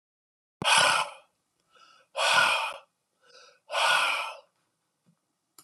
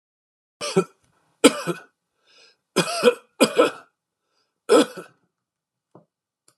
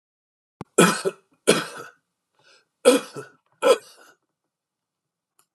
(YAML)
exhalation_length: 5.6 s
exhalation_amplitude: 12861
exhalation_signal_mean_std_ratio: 0.44
three_cough_length: 6.6 s
three_cough_amplitude: 32767
three_cough_signal_mean_std_ratio: 0.29
cough_length: 5.5 s
cough_amplitude: 25643
cough_signal_mean_std_ratio: 0.28
survey_phase: alpha (2021-03-01 to 2021-08-12)
age: 65+
gender: Male
wearing_mask: 'No'
symptom_none: true
smoker_status: Ex-smoker
respiratory_condition_asthma: false
respiratory_condition_other: false
recruitment_source: REACT
submission_delay: 1 day
covid_test_result: Negative
covid_test_method: RT-qPCR